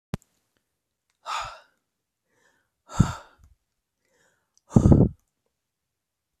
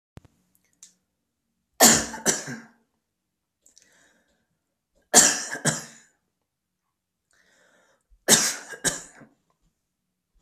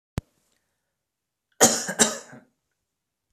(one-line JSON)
{"exhalation_length": "6.4 s", "exhalation_amplitude": 23894, "exhalation_signal_mean_std_ratio": 0.21, "three_cough_length": "10.4 s", "three_cough_amplitude": 32768, "three_cough_signal_mean_std_ratio": 0.25, "cough_length": "3.3 s", "cough_amplitude": 26832, "cough_signal_mean_std_ratio": 0.25, "survey_phase": "beta (2021-08-13 to 2022-03-07)", "age": "18-44", "gender": "Male", "wearing_mask": "No", "symptom_cough_any": true, "symptom_runny_or_blocked_nose": true, "symptom_fatigue": true, "smoker_status": "Never smoked", "respiratory_condition_asthma": false, "respiratory_condition_other": false, "recruitment_source": "Test and Trace", "submission_delay": "2 days", "covid_test_result": "Positive", "covid_test_method": "LFT"}